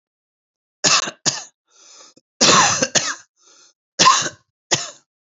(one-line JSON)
{"three_cough_length": "5.3 s", "three_cough_amplitude": 32284, "three_cough_signal_mean_std_ratio": 0.4, "survey_phase": "beta (2021-08-13 to 2022-03-07)", "age": "45-64", "gender": "Male", "wearing_mask": "No", "symptom_cough_any": true, "symptom_runny_or_blocked_nose": true, "symptom_shortness_of_breath": true, "symptom_sore_throat": true, "symptom_fatigue": true, "symptom_fever_high_temperature": true, "symptom_headache": true, "symptom_change_to_sense_of_smell_or_taste": true, "smoker_status": "Never smoked", "respiratory_condition_asthma": false, "respiratory_condition_other": false, "recruitment_source": "Test and Trace", "submission_delay": "3 days", "covid_test_result": "Negative", "covid_test_method": "RT-qPCR"}